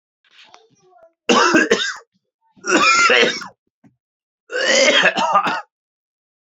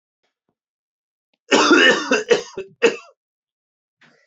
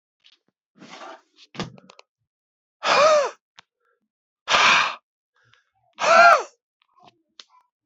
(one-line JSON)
{"three_cough_length": "6.5 s", "three_cough_amplitude": 28525, "three_cough_signal_mean_std_ratio": 0.51, "cough_length": "4.3 s", "cough_amplitude": 27961, "cough_signal_mean_std_ratio": 0.37, "exhalation_length": "7.9 s", "exhalation_amplitude": 25714, "exhalation_signal_mean_std_ratio": 0.33, "survey_phase": "beta (2021-08-13 to 2022-03-07)", "age": "18-44", "gender": "Male", "wearing_mask": "No", "symptom_cough_any": true, "symptom_runny_or_blocked_nose": true, "symptom_sore_throat": true, "symptom_fatigue": true, "symptom_headache": true, "symptom_onset": "3 days", "smoker_status": "Never smoked", "respiratory_condition_asthma": false, "respiratory_condition_other": false, "recruitment_source": "Test and Trace", "submission_delay": "1 day", "covid_test_result": "Positive", "covid_test_method": "RT-qPCR", "covid_ct_value": 12.8, "covid_ct_gene": "ORF1ab gene", "covid_ct_mean": 13.1, "covid_viral_load": "50000000 copies/ml", "covid_viral_load_category": "High viral load (>1M copies/ml)"}